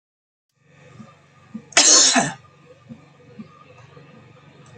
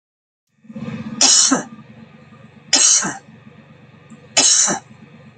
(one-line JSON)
{"cough_length": "4.8 s", "cough_amplitude": 32767, "cough_signal_mean_std_ratio": 0.3, "three_cough_length": "5.4 s", "three_cough_amplitude": 32768, "three_cough_signal_mean_std_ratio": 0.45, "survey_phase": "beta (2021-08-13 to 2022-03-07)", "age": "65+", "gender": "Female", "wearing_mask": "Yes", "symptom_shortness_of_breath": true, "symptom_onset": "7 days", "smoker_status": "Ex-smoker", "respiratory_condition_asthma": true, "respiratory_condition_other": false, "recruitment_source": "REACT", "submission_delay": "1 day", "covid_test_result": "Negative", "covid_test_method": "RT-qPCR", "influenza_a_test_result": "Unknown/Void", "influenza_b_test_result": "Unknown/Void"}